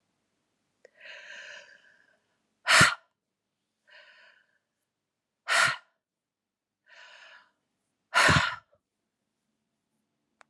{
  "exhalation_length": "10.5 s",
  "exhalation_amplitude": 16200,
  "exhalation_signal_mean_std_ratio": 0.24,
  "survey_phase": "beta (2021-08-13 to 2022-03-07)",
  "age": "45-64",
  "gender": "Female",
  "wearing_mask": "No",
  "symptom_runny_or_blocked_nose": true,
  "symptom_onset": "3 days",
  "smoker_status": "Never smoked",
  "respiratory_condition_asthma": false,
  "respiratory_condition_other": false,
  "recruitment_source": "Test and Trace",
  "submission_delay": "2 days",
  "covid_test_result": "Positive",
  "covid_test_method": "ePCR"
}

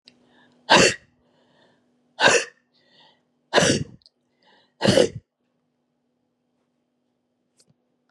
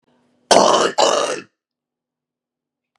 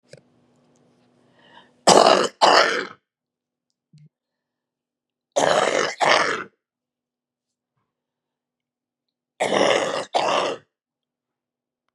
{
  "exhalation_length": "8.1 s",
  "exhalation_amplitude": 27745,
  "exhalation_signal_mean_std_ratio": 0.28,
  "cough_length": "3.0 s",
  "cough_amplitude": 32768,
  "cough_signal_mean_std_ratio": 0.4,
  "three_cough_length": "11.9 s",
  "three_cough_amplitude": 32768,
  "three_cough_signal_mean_std_ratio": 0.35,
  "survey_phase": "beta (2021-08-13 to 2022-03-07)",
  "age": "65+",
  "gender": "Female",
  "wearing_mask": "No",
  "symptom_cough_any": true,
  "symptom_shortness_of_breath": true,
  "symptom_fatigue": true,
  "symptom_headache": true,
  "symptom_onset": "2 days",
  "smoker_status": "Ex-smoker",
  "respiratory_condition_asthma": true,
  "respiratory_condition_other": true,
  "recruitment_source": "Test and Trace",
  "submission_delay": "1 day",
  "covid_test_result": "Positive",
  "covid_test_method": "RT-qPCR",
  "covid_ct_value": 14.0,
  "covid_ct_gene": "ORF1ab gene",
  "covid_ct_mean": 14.2,
  "covid_viral_load": "23000000 copies/ml",
  "covid_viral_load_category": "High viral load (>1M copies/ml)"
}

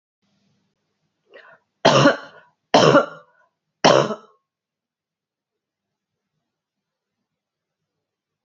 {
  "three_cough_length": "8.4 s",
  "three_cough_amplitude": 30592,
  "three_cough_signal_mean_std_ratio": 0.25,
  "survey_phase": "beta (2021-08-13 to 2022-03-07)",
  "age": "45-64",
  "gender": "Female",
  "wearing_mask": "No",
  "symptom_new_continuous_cough": true,
  "symptom_runny_or_blocked_nose": true,
  "symptom_sore_throat": true,
  "symptom_fatigue": true,
  "symptom_headache": true,
  "symptom_change_to_sense_of_smell_or_taste": true,
  "symptom_onset": "3 days",
  "smoker_status": "Never smoked",
  "respiratory_condition_asthma": false,
  "respiratory_condition_other": false,
  "recruitment_source": "Test and Trace",
  "submission_delay": "2 days",
  "covid_test_result": "Positive",
  "covid_test_method": "RT-qPCR",
  "covid_ct_value": 27.8,
  "covid_ct_gene": "ORF1ab gene",
  "covid_ct_mean": 28.4,
  "covid_viral_load": "470 copies/ml",
  "covid_viral_load_category": "Minimal viral load (< 10K copies/ml)"
}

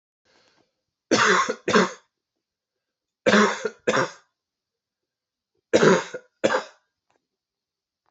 {
  "three_cough_length": "8.1 s",
  "three_cough_amplitude": 22762,
  "three_cough_signal_mean_std_ratio": 0.35,
  "survey_phase": "alpha (2021-03-01 to 2021-08-12)",
  "age": "18-44",
  "gender": "Male",
  "wearing_mask": "No",
  "symptom_cough_any": true,
  "symptom_fatigue": true,
  "symptom_fever_high_temperature": true,
  "symptom_headache": true,
  "smoker_status": "Never smoked",
  "respiratory_condition_asthma": false,
  "respiratory_condition_other": false,
  "recruitment_source": "Test and Trace",
  "submission_delay": "1 day",
  "covid_test_result": "Positive",
  "covid_test_method": "RT-qPCR",
  "covid_ct_value": 19.2,
  "covid_ct_gene": "ORF1ab gene"
}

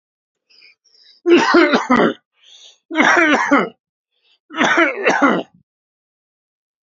{
  "three_cough_length": "6.8 s",
  "three_cough_amplitude": 32767,
  "three_cough_signal_mean_std_ratio": 0.49,
  "survey_phase": "beta (2021-08-13 to 2022-03-07)",
  "age": "45-64",
  "gender": "Male",
  "wearing_mask": "No",
  "symptom_none": true,
  "smoker_status": "Ex-smoker",
  "respiratory_condition_asthma": false,
  "respiratory_condition_other": false,
  "recruitment_source": "REACT",
  "submission_delay": "2 days",
  "covid_test_result": "Negative",
  "covid_test_method": "RT-qPCR",
  "influenza_a_test_result": "Unknown/Void",
  "influenza_b_test_result": "Unknown/Void"
}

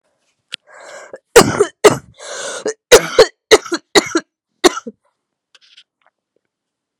{
  "cough_length": "7.0 s",
  "cough_amplitude": 32768,
  "cough_signal_mean_std_ratio": 0.3,
  "survey_phase": "beta (2021-08-13 to 2022-03-07)",
  "age": "18-44",
  "gender": "Female",
  "wearing_mask": "No",
  "symptom_cough_any": true,
  "symptom_new_continuous_cough": true,
  "symptom_runny_or_blocked_nose": true,
  "symptom_shortness_of_breath": true,
  "symptom_sore_throat": true,
  "symptom_fatigue": true,
  "symptom_fever_high_temperature": true,
  "symptom_change_to_sense_of_smell_or_taste": true,
  "symptom_loss_of_taste": true,
  "symptom_onset": "3 days",
  "smoker_status": "Current smoker (1 to 10 cigarettes per day)",
  "respiratory_condition_asthma": false,
  "respiratory_condition_other": false,
  "recruitment_source": "Test and Trace",
  "submission_delay": "1 day",
  "covid_test_result": "Positive",
  "covid_test_method": "RT-qPCR",
  "covid_ct_value": 24.8,
  "covid_ct_gene": "ORF1ab gene"
}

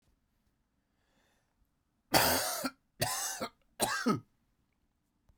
{
  "three_cough_length": "5.4 s",
  "three_cough_amplitude": 9370,
  "three_cough_signal_mean_std_ratio": 0.38,
  "survey_phase": "beta (2021-08-13 to 2022-03-07)",
  "age": "45-64",
  "gender": "Male",
  "wearing_mask": "No",
  "symptom_cough_any": true,
  "symptom_new_continuous_cough": true,
  "symptom_runny_or_blocked_nose": true,
  "symptom_shortness_of_breath": true,
  "symptom_fatigue": true,
  "symptom_headache": true,
  "symptom_change_to_sense_of_smell_or_taste": true,
  "smoker_status": "Ex-smoker",
  "respiratory_condition_asthma": false,
  "respiratory_condition_other": false,
  "recruitment_source": "Test and Trace",
  "submission_delay": "1 day",
  "covid_test_result": "Positive",
  "covid_test_method": "RT-qPCR"
}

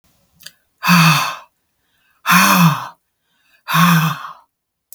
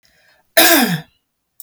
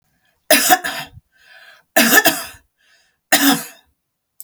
{
  "exhalation_length": "4.9 s",
  "exhalation_amplitude": 32768,
  "exhalation_signal_mean_std_ratio": 0.48,
  "cough_length": "1.6 s",
  "cough_amplitude": 32768,
  "cough_signal_mean_std_ratio": 0.42,
  "three_cough_length": "4.4 s",
  "three_cough_amplitude": 32768,
  "three_cough_signal_mean_std_ratio": 0.39,
  "survey_phase": "beta (2021-08-13 to 2022-03-07)",
  "age": "45-64",
  "gender": "Female",
  "wearing_mask": "No",
  "symptom_none": true,
  "smoker_status": "Never smoked",
  "respiratory_condition_asthma": false,
  "respiratory_condition_other": false,
  "recruitment_source": "REACT",
  "submission_delay": "1 day",
  "covid_test_result": "Negative",
  "covid_test_method": "RT-qPCR",
  "influenza_a_test_result": "Negative",
  "influenza_b_test_result": "Negative"
}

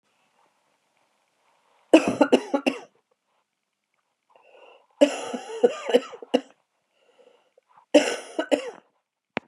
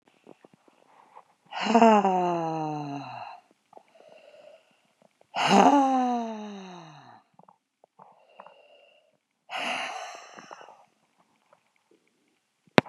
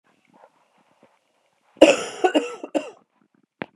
{
  "three_cough_length": "9.5 s",
  "three_cough_amplitude": 31748,
  "three_cough_signal_mean_std_ratio": 0.27,
  "exhalation_length": "12.9 s",
  "exhalation_amplitude": 32768,
  "exhalation_signal_mean_std_ratio": 0.34,
  "cough_length": "3.8 s",
  "cough_amplitude": 32768,
  "cough_signal_mean_std_ratio": 0.25,
  "survey_phase": "beta (2021-08-13 to 2022-03-07)",
  "age": "45-64",
  "gender": "Female",
  "wearing_mask": "No",
  "symptom_new_continuous_cough": true,
  "symptom_runny_or_blocked_nose": true,
  "symptom_shortness_of_breath": true,
  "symptom_sore_throat": true,
  "symptom_fatigue": true,
  "symptom_headache": true,
  "symptom_other": true,
  "symptom_onset": "3 days",
  "smoker_status": "Never smoked",
  "respiratory_condition_asthma": true,
  "respiratory_condition_other": false,
  "recruitment_source": "Test and Trace",
  "submission_delay": "0 days",
  "covid_test_method": "ePCR"
}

